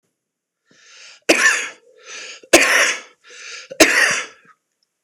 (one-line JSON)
{"three_cough_length": "5.0 s", "three_cough_amplitude": 26028, "three_cough_signal_mean_std_ratio": 0.41, "survey_phase": "beta (2021-08-13 to 2022-03-07)", "age": "45-64", "gender": "Male", "wearing_mask": "No", "symptom_none": true, "smoker_status": "Never smoked", "respiratory_condition_asthma": false, "respiratory_condition_other": false, "recruitment_source": "REACT", "submission_delay": "6 days", "covid_test_result": "Negative", "covid_test_method": "RT-qPCR", "influenza_a_test_result": "Negative", "influenza_b_test_result": "Negative"}